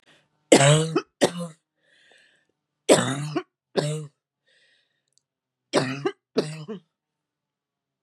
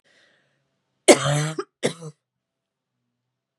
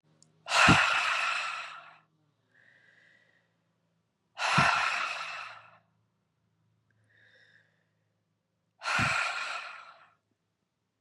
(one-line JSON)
{"three_cough_length": "8.0 s", "three_cough_amplitude": 32168, "three_cough_signal_mean_std_ratio": 0.33, "cough_length": "3.6 s", "cough_amplitude": 32756, "cough_signal_mean_std_ratio": 0.25, "exhalation_length": "11.0 s", "exhalation_amplitude": 12518, "exhalation_signal_mean_std_ratio": 0.39, "survey_phase": "beta (2021-08-13 to 2022-03-07)", "age": "65+", "gender": "Female", "wearing_mask": "No", "symptom_cough_any": true, "symptom_runny_or_blocked_nose": true, "symptom_shortness_of_breath": true, "symptom_sore_throat": true, "symptom_abdominal_pain": true, "symptom_diarrhoea": true, "symptom_fatigue": true, "symptom_onset": "5 days", "smoker_status": "Ex-smoker", "respiratory_condition_asthma": false, "respiratory_condition_other": false, "recruitment_source": "Test and Trace", "submission_delay": "2 days", "covid_test_result": "Positive", "covid_test_method": "RT-qPCR", "covid_ct_value": 24.6, "covid_ct_gene": "N gene"}